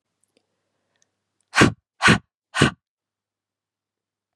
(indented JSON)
{
  "exhalation_length": "4.4 s",
  "exhalation_amplitude": 32768,
  "exhalation_signal_mean_std_ratio": 0.24,
  "survey_phase": "beta (2021-08-13 to 2022-03-07)",
  "age": "45-64",
  "gender": "Female",
  "wearing_mask": "No",
  "symptom_none": true,
  "smoker_status": "Ex-smoker",
  "respiratory_condition_asthma": false,
  "respiratory_condition_other": false,
  "recruitment_source": "REACT",
  "submission_delay": "2 days",
  "covid_test_result": "Negative",
  "covid_test_method": "RT-qPCR",
  "influenza_a_test_result": "Negative",
  "influenza_b_test_result": "Negative"
}